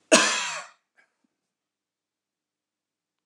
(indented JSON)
{
  "cough_length": "3.3 s",
  "cough_amplitude": 25604,
  "cough_signal_mean_std_ratio": 0.25,
  "survey_phase": "beta (2021-08-13 to 2022-03-07)",
  "age": "45-64",
  "gender": "Male",
  "wearing_mask": "No",
  "symptom_none": true,
  "smoker_status": "Never smoked",
  "respiratory_condition_asthma": false,
  "respiratory_condition_other": false,
  "recruitment_source": "REACT",
  "submission_delay": "1 day",
  "covid_test_result": "Negative",
  "covid_test_method": "RT-qPCR"
}